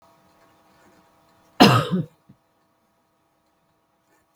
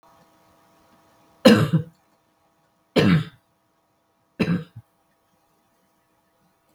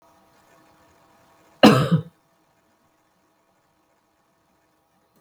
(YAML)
exhalation_length: 4.4 s
exhalation_amplitude: 32767
exhalation_signal_mean_std_ratio: 0.22
three_cough_length: 6.7 s
three_cough_amplitude: 32766
three_cough_signal_mean_std_ratio: 0.27
cough_length: 5.2 s
cough_amplitude: 32768
cough_signal_mean_std_ratio: 0.2
survey_phase: beta (2021-08-13 to 2022-03-07)
age: 45-64
gender: Female
wearing_mask: 'No'
symptom_runny_or_blocked_nose: true
symptom_onset: 5 days
smoker_status: Never smoked
respiratory_condition_asthma: false
respiratory_condition_other: false
recruitment_source: REACT
submission_delay: 1 day
covid_test_method: RT-qPCR
influenza_a_test_result: Unknown/Void
influenza_b_test_result: Unknown/Void